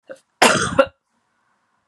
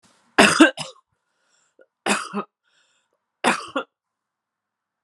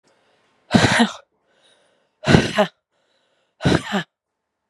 {"cough_length": "1.9 s", "cough_amplitude": 32747, "cough_signal_mean_std_ratio": 0.33, "three_cough_length": "5.0 s", "three_cough_amplitude": 32767, "three_cough_signal_mean_std_ratio": 0.27, "exhalation_length": "4.7 s", "exhalation_amplitude": 32768, "exhalation_signal_mean_std_ratio": 0.35, "survey_phase": "beta (2021-08-13 to 2022-03-07)", "age": "45-64", "gender": "Female", "wearing_mask": "No", "symptom_cough_any": true, "symptom_new_continuous_cough": true, "symptom_runny_or_blocked_nose": true, "symptom_shortness_of_breath": true, "symptom_sore_throat": true, "symptom_fatigue": true, "symptom_headache": true, "symptom_change_to_sense_of_smell_or_taste": true, "symptom_loss_of_taste": true, "symptom_other": true, "symptom_onset": "2 days", "smoker_status": "Never smoked", "respiratory_condition_asthma": false, "respiratory_condition_other": false, "recruitment_source": "Test and Trace", "submission_delay": "1 day", "covid_test_result": "Positive", "covid_test_method": "RT-qPCR", "covid_ct_value": 17.3, "covid_ct_gene": "S gene", "covid_ct_mean": 18.0, "covid_viral_load": "1300000 copies/ml", "covid_viral_load_category": "High viral load (>1M copies/ml)"}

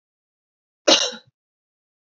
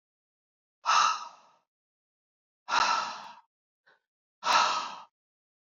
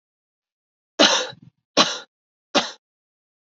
{"cough_length": "2.1 s", "cough_amplitude": 28463, "cough_signal_mean_std_ratio": 0.23, "exhalation_length": "5.6 s", "exhalation_amplitude": 10349, "exhalation_signal_mean_std_ratio": 0.38, "three_cough_length": "3.5 s", "three_cough_amplitude": 32768, "three_cough_signal_mean_std_ratio": 0.29, "survey_phase": "beta (2021-08-13 to 2022-03-07)", "age": "18-44", "gender": "Female", "wearing_mask": "No", "symptom_cough_any": true, "symptom_runny_or_blocked_nose": true, "symptom_fatigue": true, "symptom_change_to_sense_of_smell_or_taste": true, "symptom_onset": "5 days", "smoker_status": "Never smoked", "respiratory_condition_asthma": true, "respiratory_condition_other": false, "recruitment_source": "REACT", "submission_delay": "1 day", "covid_test_result": "Negative", "covid_test_method": "RT-qPCR", "influenza_a_test_result": "Unknown/Void", "influenza_b_test_result": "Unknown/Void"}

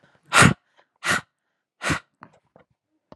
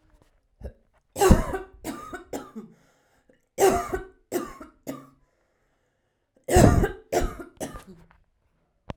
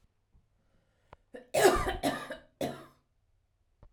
{"exhalation_length": "3.2 s", "exhalation_amplitude": 32767, "exhalation_signal_mean_std_ratio": 0.27, "three_cough_length": "9.0 s", "three_cough_amplitude": 26685, "three_cough_signal_mean_std_ratio": 0.33, "cough_length": "3.9 s", "cough_amplitude": 10443, "cough_signal_mean_std_ratio": 0.33, "survey_phase": "alpha (2021-03-01 to 2021-08-12)", "age": "18-44", "gender": "Female", "wearing_mask": "No", "symptom_none": true, "smoker_status": "Current smoker (1 to 10 cigarettes per day)", "respiratory_condition_asthma": false, "respiratory_condition_other": false, "recruitment_source": "REACT", "submission_delay": "1 day", "covid_test_result": "Negative", "covid_test_method": "RT-qPCR"}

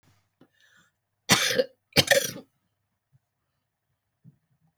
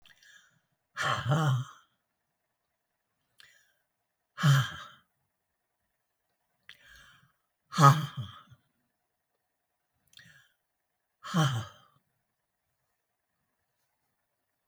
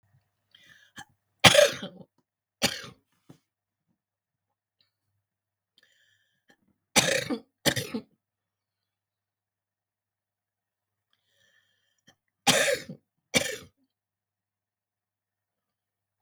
{"cough_length": "4.8 s", "cough_amplitude": 23247, "cough_signal_mean_std_ratio": 0.26, "exhalation_length": "14.7 s", "exhalation_amplitude": 16507, "exhalation_signal_mean_std_ratio": 0.25, "three_cough_length": "16.2 s", "three_cough_amplitude": 32768, "three_cough_signal_mean_std_ratio": 0.21, "survey_phase": "beta (2021-08-13 to 2022-03-07)", "age": "65+", "gender": "Female", "wearing_mask": "No", "symptom_cough_any": true, "symptom_shortness_of_breath": true, "symptom_fatigue": true, "symptom_headache": true, "symptom_onset": "10 days", "smoker_status": "Ex-smoker", "respiratory_condition_asthma": false, "respiratory_condition_other": true, "recruitment_source": "REACT", "submission_delay": "2 days", "covid_test_result": "Negative", "covid_test_method": "RT-qPCR"}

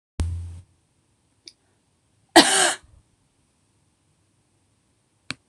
{"cough_length": "5.5 s", "cough_amplitude": 26028, "cough_signal_mean_std_ratio": 0.23, "survey_phase": "beta (2021-08-13 to 2022-03-07)", "age": "45-64", "gender": "Female", "wearing_mask": "No", "symptom_headache": true, "smoker_status": "Never smoked", "respiratory_condition_asthma": false, "respiratory_condition_other": false, "recruitment_source": "REACT", "submission_delay": "1 day", "covid_test_result": "Negative", "covid_test_method": "RT-qPCR"}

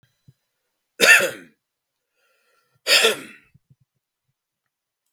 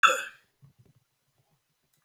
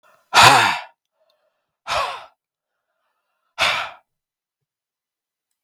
{"three_cough_length": "5.1 s", "three_cough_amplitude": 32767, "three_cough_signal_mean_std_ratio": 0.26, "cough_length": "2.0 s", "cough_amplitude": 21069, "cough_signal_mean_std_ratio": 0.22, "exhalation_length": "5.6 s", "exhalation_amplitude": 32768, "exhalation_signal_mean_std_ratio": 0.29, "survey_phase": "beta (2021-08-13 to 2022-03-07)", "age": "45-64", "gender": "Male", "wearing_mask": "No", "symptom_cough_any": true, "smoker_status": "Never smoked", "respiratory_condition_asthma": false, "respiratory_condition_other": false, "recruitment_source": "Test and Trace", "submission_delay": "0 days", "covid_test_result": "Negative", "covid_test_method": "LFT"}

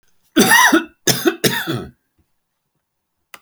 {"cough_length": "3.4 s", "cough_amplitude": 32768, "cough_signal_mean_std_ratio": 0.43, "survey_phase": "beta (2021-08-13 to 2022-03-07)", "age": "65+", "gender": "Male", "wearing_mask": "No", "symptom_none": true, "smoker_status": "Ex-smoker", "respiratory_condition_asthma": false, "respiratory_condition_other": true, "recruitment_source": "REACT", "submission_delay": "1 day", "covid_test_result": "Negative", "covid_test_method": "RT-qPCR"}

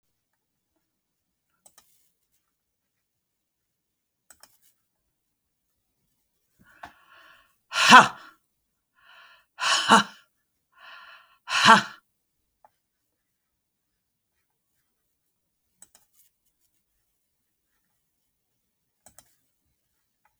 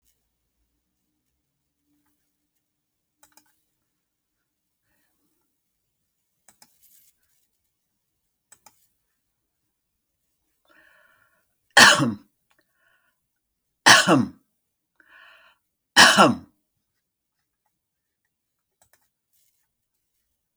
{"exhalation_length": "20.4 s", "exhalation_amplitude": 30786, "exhalation_signal_mean_std_ratio": 0.16, "three_cough_length": "20.6 s", "three_cough_amplitude": 32337, "three_cough_signal_mean_std_ratio": 0.17, "survey_phase": "beta (2021-08-13 to 2022-03-07)", "age": "65+", "gender": "Female", "wearing_mask": "No", "symptom_none": true, "smoker_status": "Ex-smoker", "respiratory_condition_asthma": false, "respiratory_condition_other": false, "recruitment_source": "REACT", "submission_delay": "6 days", "covid_test_result": "Negative", "covid_test_method": "RT-qPCR", "covid_ct_value": 45.0, "covid_ct_gene": "N gene"}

